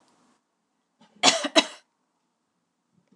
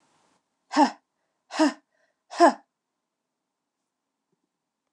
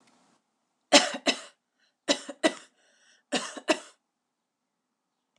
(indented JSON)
{
  "cough_length": "3.2 s",
  "cough_amplitude": 28412,
  "cough_signal_mean_std_ratio": 0.22,
  "exhalation_length": "4.9 s",
  "exhalation_amplitude": 17051,
  "exhalation_signal_mean_std_ratio": 0.23,
  "three_cough_length": "5.4 s",
  "three_cough_amplitude": 29202,
  "three_cough_signal_mean_std_ratio": 0.25,
  "survey_phase": "alpha (2021-03-01 to 2021-08-12)",
  "age": "45-64",
  "gender": "Female",
  "wearing_mask": "No",
  "symptom_none": true,
  "smoker_status": "Never smoked",
  "respiratory_condition_asthma": false,
  "respiratory_condition_other": false,
  "recruitment_source": "REACT",
  "submission_delay": "1 day",
  "covid_test_result": "Negative",
  "covid_test_method": "RT-qPCR"
}